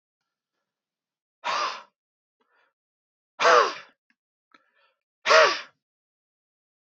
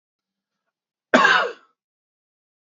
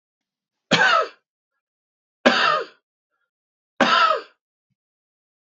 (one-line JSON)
{"exhalation_length": "6.9 s", "exhalation_amplitude": 24089, "exhalation_signal_mean_std_ratio": 0.26, "cough_length": "2.6 s", "cough_amplitude": 27335, "cough_signal_mean_std_ratio": 0.29, "three_cough_length": "5.5 s", "three_cough_amplitude": 27935, "three_cough_signal_mean_std_ratio": 0.37, "survey_phase": "beta (2021-08-13 to 2022-03-07)", "age": "45-64", "gender": "Male", "wearing_mask": "No", "symptom_none": true, "smoker_status": "Never smoked", "respiratory_condition_asthma": false, "respiratory_condition_other": false, "recruitment_source": "REACT", "submission_delay": "2 days", "covid_test_result": "Negative", "covid_test_method": "RT-qPCR", "influenza_a_test_result": "Negative", "influenza_b_test_result": "Negative"}